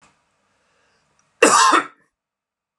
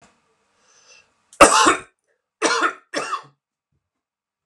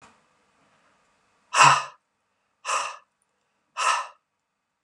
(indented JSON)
{
  "cough_length": "2.8 s",
  "cough_amplitude": 32768,
  "cough_signal_mean_std_ratio": 0.31,
  "three_cough_length": "4.5 s",
  "three_cough_amplitude": 32768,
  "three_cough_signal_mean_std_ratio": 0.3,
  "exhalation_length": "4.8 s",
  "exhalation_amplitude": 29154,
  "exhalation_signal_mean_std_ratio": 0.28,
  "survey_phase": "beta (2021-08-13 to 2022-03-07)",
  "age": "45-64",
  "gender": "Male",
  "wearing_mask": "No",
  "symptom_none": true,
  "smoker_status": "Never smoked",
  "respiratory_condition_asthma": false,
  "respiratory_condition_other": false,
  "recruitment_source": "REACT",
  "submission_delay": "3 days",
  "covid_test_result": "Negative",
  "covid_test_method": "RT-qPCR",
  "influenza_a_test_result": "Negative",
  "influenza_b_test_result": "Negative"
}